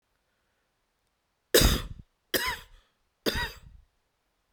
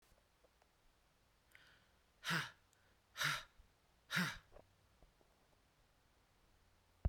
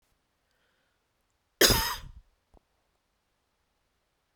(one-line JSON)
{"three_cough_length": "4.5 s", "three_cough_amplitude": 17070, "three_cough_signal_mean_std_ratio": 0.3, "exhalation_length": "7.1 s", "exhalation_amplitude": 2436, "exhalation_signal_mean_std_ratio": 0.29, "cough_length": "4.4 s", "cough_amplitude": 21582, "cough_signal_mean_std_ratio": 0.21, "survey_phase": "beta (2021-08-13 to 2022-03-07)", "age": "45-64", "gender": "Female", "wearing_mask": "No", "symptom_runny_or_blocked_nose": true, "symptom_sore_throat": true, "symptom_headache": true, "smoker_status": "Never smoked", "respiratory_condition_asthma": false, "respiratory_condition_other": false, "recruitment_source": "Test and Trace", "submission_delay": "3 days", "covid_test_result": "Negative", "covid_test_method": "RT-qPCR"}